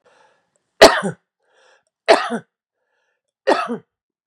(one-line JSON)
{"cough_length": "4.3 s", "cough_amplitude": 32768, "cough_signal_mean_std_ratio": 0.27, "survey_phase": "beta (2021-08-13 to 2022-03-07)", "age": "45-64", "gender": "Male", "wearing_mask": "No", "symptom_none": true, "smoker_status": "Never smoked", "respiratory_condition_asthma": false, "respiratory_condition_other": false, "recruitment_source": "REACT", "submission_delay": "0 days", "covid_test_result": "Negative", "covid_test_method": "RT-qPCR"}